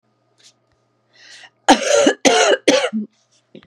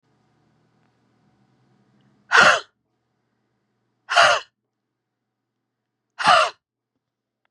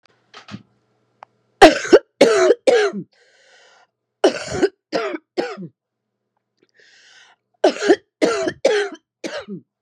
{"cough_length": "3.7 s", "cough_amplitude": 32767, "cough_signal_mean_std_ratio": 0.44, "exhalation_length": "7.5 s", "exhalation_amplitude": 30646, "exhalation_signal_mean_std_ratio": 0.26, "three_cough_length": "9.8 s", "three_cough_amplitude": 32768, "three_cough_signal_mean_std_ratio": 0.36, "survey_phase": "beta (2021-08-13 to 2022-03-07)", "age": "45-64", "gender": "Female", "wearing_mask": "No", "symptom_cough_any": true, "symptom_sore_throat": true, "symptom_fatigue": true, "symptom_headache": true, "symptom_change_to_sense_of_smell_or_taste": true, "symptom_loss_of_taste": true, "symptom_onset": "6 days", "smoker_status": "Ex-smoker", "respiratory_condition_asthma": false, "respiratory_condition_other": false, "recruitment_source": "Test and Trace", "submission_delay": "1 day", "covid_test_result": "Positive", "covid_test_method": "RT-qPCR", "covid_ct_value": 24.5, "covid_ct_gene": "ORF1ab gene", "covid_ct_mean": 25.0, "covid_viral_load": "6400 copies/ml", "covid_viral_load_category": "Minimal viral load (< 10K copies/ml)"}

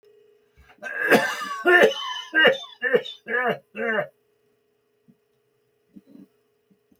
{"cough_length": "7.0 s", "cough_amplitude": 23210, "cough_signal_mean_std_ratio": 0.41, "survey_phase": "beta (2021-08-13 to 2022-03-07)", "age": "65+", "gender": "Male", "wearing_mask": "No", "symptom_none": true, "smoker_status": "Ex-smoker", "respiratory_condition_asthma": false, "respiratory_condition_other": false, "recruitment_source": "REACT", "submission_delay": "9 days", "covid_test_result": "Negative", "covid_test_method": "RT-qPCR"}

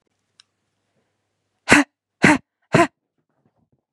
{"exhalation_length": "3.9 s", "exhalation_amplitude": 32768, "exhalation_signal_mean_std_ratio": 0.25, "survey_phase": "beta (2021-08-13 to 2022-03-07)", "age": "18-44", "gender": "Female", "wearing_mask": "No", "symptom_headache": true, "smoker_status": "Never smoked", "respiratory_condition_asthma": false, "respiratory_condition_other": false, "recruitment_source": "REACT", "submission_delay": "4 days", "covid_test_result": "Negative", "covid_test_method": "RT-qPCR", "influenza_a_test_result": "Negative", "influenza_b_test_result": "Negative"}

